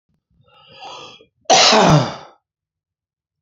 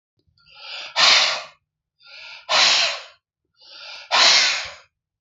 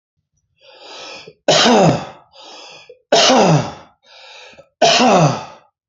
{"cough_length": "3.4 s", "cough_amplitude": 31027, "cough_signal_mean_std_ratio": 0.37, "exhalation_length": "5.2 s", "exhalation_amplitude": 27064, "exhalation_signal_mean_std_ratio": 0.46, "three_cough_length": "5.9 s", "three_cough_amplitude": 32669, "three_cough_signal_mean_std_ratio": 0.49, "survey_phase": "beta (2021-08-13 to 2022-03-07)", "age": "65+", "gender": "Male", "wearing_mask": "No", "symptom_cough_any": true, "symptom_runny_or_blocked_nose": true, "symptom_change_to_sense_of_smell_or_taste": true, "symptom_loss_of_taste": true, "symptom_onset": "4 days", "smoker_status": "Ex-smoker", "respiratory_condition_asthma": false, "respiratory_condition_other": true, "recruitment_source": "Test and Trace", "submission_delay": "1 day", "covid_test_result": "Positive", "covid_test_method": "RT-qPCR"}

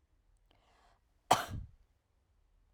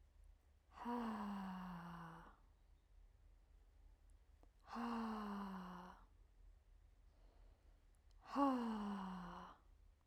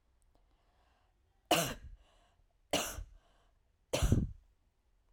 {"cough_length": "2.7 s", "cough_amplitude": 10161, "cough_signal_mean_std_ratio": 0.2, "exhalation_length": "10.1 s", "exhalation_amplitude": 1683, "exhalation_signal_mean_std_ratio": 0.57, "three_cough_length": "5.1 s", "three_cough_amplitude": 6714, "three_cough_signal_mean_std_ratio": 0.32, "survey_phase": "beta (2021-08-13 to 2022-03-07)", "age": "18-44", "gender": "Female", "wearing_mask": "No", "symptom_sore_throat": true, "symptom_onset": "3 days", "smoker_status": "Never smoked", "respiratory_condition_asthma": false, "respiratory_condition_other": false, "recruitment_source": "Test and Trace", "submission_delay": "1 day", "covid_test_result": "Positive", "covid_test_method": "RT-qPCR", "covid_ct_value": 18.9, "covid_ct_gene": "ORF1ab gene", "covid_ct_mean": 19.3, "covid_viral_load": "470000 copies/ml", "covid_viral_load_category": "Low viral load (10K-1M copies/ml)"}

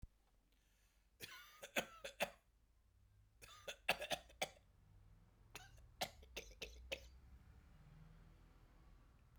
{"three_cough_length": "9.4 s", "three_cough_amplitude": 2778, "three_cough_signal_mean_std_ratio": 0.36, "survey_phase": "beta (2021-08-13 to 2022-03-07)", "age": "45-64", "gender": "Female", "wearing_mask": "No", "symptom_fatigue": true, "smoker_status": "Current smoker (11 or more cigarettes per day)", "respiratory_condition_asthma": false, "respiratory_condition_other": false, "recruitment_source": "REACT", "submission_delay": "1 day", "covid_test_result": "Negative", "covid_test_method": "RT-qPCR"}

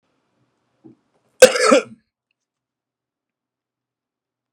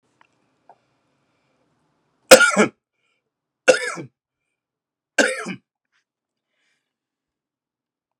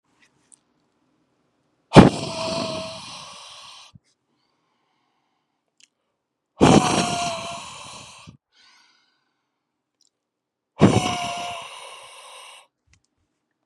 {"cough_length": "4.5 s", "cough_amplitude": 32768, "cough_signal_mean_std_ratio": 0.19, "three_cough_length": "8.2 s", "three_cough_amplitude": 32768, "three_cough_signal_mean_std_ratio": 0.2, "exhalation_length": "13.7 s", "exhalation_amplitude": 32768, "exhalation_signal_mean_std_ratio": 0.26, "survey_phase": "beta (2021-08-13 to 2022-03-07)", "age": "18-44", "gender": "Male", "wearing_mask": "No", "symptom_cough_any": true, "symptom_sore_throat": true, "symptom_abdominal_pain": true, "symptom_onset": "3 days", "smoker_status": "Current smoker (e-cigarettes or vapes only)", "respiratory_condition_asthma": true, "respiratory_condition_other": false, "recruitment_source": "Test and Trace", "submission_delay": "1 day", "covid_test_result": "Positive", "covid_test_method": "RT-qPCR", "covid_ct_value": 22.4, "covid_ct_gene": "ORF1ab gene", "covid_ct_mean": 23.0, "covid_viral_load": "28000 copies/ml", "covid_viral_load_category": "Low viral load (10K-1M copies/ml)"}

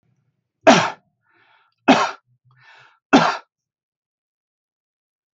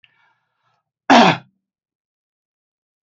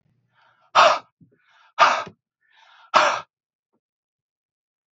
{"three_cough_length": "5.4 s", "three_cough_amplitude": 28322, "three_cough_signal_mean_std_ratio": 0.26, "cough_length": "3.1 s", "cough_amplitude": 28648, "cough_signal_mean_std_ratio": 0.24, "exhalation_length": "4.9 s", "exhalation_amplitude": 30209, "exhalation_signal_mean_std_ratio": 0.29, "survey_phase": "alpha (2021-03-01 to 2021-08-12)", "age": "45-64", "gender": "Male", "wearing_mask": "No", "symptom_none": true, "smoker_status": "Never smoked", "respiratory_condition_asthma": false, "respiratory_condition_other": false, "recruitment_source": "REACT", "submission_delay": "2 days", "covid_test_result": "Negative", "covid_test_method": "RT-qPCR"}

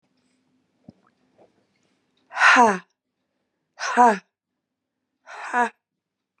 {"exhalation_length": "6.4 s", "exhalation_amplitude": 27981, "exhalation_signal_mean_std_ratio": 0.28, "survey_phase": "beta (2021-08-13 to 2022-03-07)", "age": "45-64", "gender": "Female", "wearing_mask": "No", "symptom_cough_any": true, "symptom_sore_throat": true, "symptom_diarrhoea": true, "symptom_fatigue": true, "symptom_headache": true, "symptom_change_to_sense_of_smell_or_taste": true, "symptom_onset": "3 days", "smoker_status": "Ex-smoker", "respiratory_condition_asthma": false, "respiratory_condition_other": false, "recruitment_source": "Test and Trace", "submission_delay": "1 day", "covid_test_result": "Positive", "covid_test_method": "RT-qPCR", "covid_ct_value": 12.9, "covid_ct_gene": "ORF1ab gene", "covid_ct_mean": 13.6, "covid_viral_load": "35000000 copies/ml", "covid_viral_load_category": "High viral load (>1M copies/ml)"}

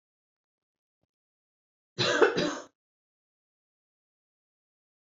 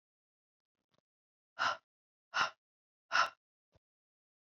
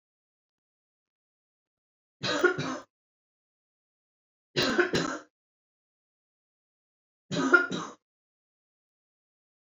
{"cough_length": "5.0 s", "cough_amplitude": 14925, "cough_signal_mean_std_ratio": 0.24, "exhalation_length": "4.4 s", "exhalation_amplitude": 4615, "exhalation_signal_mean_std_ratio": 0.25, "three_cough_length": "9.6 s", "three_cough_amplitude": 16646, "three_cough_signal_mean_std_ratio": 0.28, "survey_phase": "beta (2021-08-13 to 2022-03-07)", "age": "18-44", "gender": "Female", "wearing_mask": "No", "symptom_cough_any": true, "symptom_sore_throat": true, "symptom_fatigue": true, "symptom_headache": true, "smoker_status": "Never smoked", "respiratory_condition_asthma": false, "respiratory_condition_other": false, "recruitment_source": "Test and Trace", "submission_delay": "1 day", "covid_test_method": "RT-qPCR", "covid_ct_value": 17.1, "covid_ct_gene": "ORF1ab gene", "covid_ct_mean": 17.3, "covid_viral_load": "2100000 copies/ml", "covid_viral_load_category": "High viral load (>1M copies/ml)"}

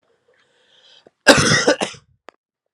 {"cough_length": "2.7 s", "cough_amplitude": 32768, "cough_signal_mean_std_ratio": 0.33, "survey_phase": "alpha (2021-03-01 to 2021-08-12)", "age": "18-44", "gender": "Male", "wearing_mask": "No", "symptom_cough_any": true, "symptom_change_to_sense_of_smell_or_taste": true, "symptom_onset": "3 days", "smoker_status": "Never smoked", "respiratory_condition_asthma": false, "respiratory_condition_other": false, "recruitment_source": "Test and Trace", "submission_delay": "1 day", "covid_test_result": "Positive", "covid_test_method": "RT-qPCR"}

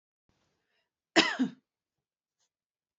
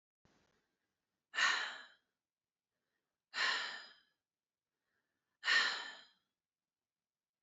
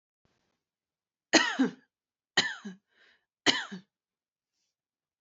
{"cough_length": "3.0 s", "cough_amplitude": 14943, "cough_signal_mean_std_ratio": 0.22, "exhalation_length": "7.4 s", "exhalation_amplitude": 3262, "exhalation_signal_mean_std_ratio": 0.31, "three_cough_length": "5.2 s", "three_cough_amplitude": 17558, "three_cough_signal_mean_std_ratio": 0.26, "survey_phase": "beta (2021-08-13 to 2022-03-07)", "age": "18-44", "gender": "Female", "wearing_mask": "No", "symptom_none": true, "smoker_status": "Never smoked", "respiratory_condition_asthma": false, "respiratory_condition_other": false, "recruitment_source": "REACT", "submission_delay": "1 day", "covid_test_result": "Negative", "covid_test_method": "RT-qPCR"}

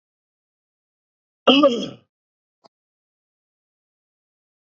{"cough_length": "4.7 s", "cough_amplitude": 27706, "cough_signal_mean_std_ratio": 0.21, "survey_phase": "beta (2021-08-13 to 2022-03-07)", "age": "65+", "gender": "Male", "wearing_mask": "No", "symptom_none": true, "smoker_status": "Ex-smoker", "respiratory_condition_asthma": false, "respiratory_condition_other": false, "recruitment_source": "REACT", "submission_delay": "1 day", "covid_test_result": "Negative", "covid_test_method": "RT-qPCR", "influenza_a_test_result": "Unknown/Void", "influenza_b_test_result": "Unknown/Void"}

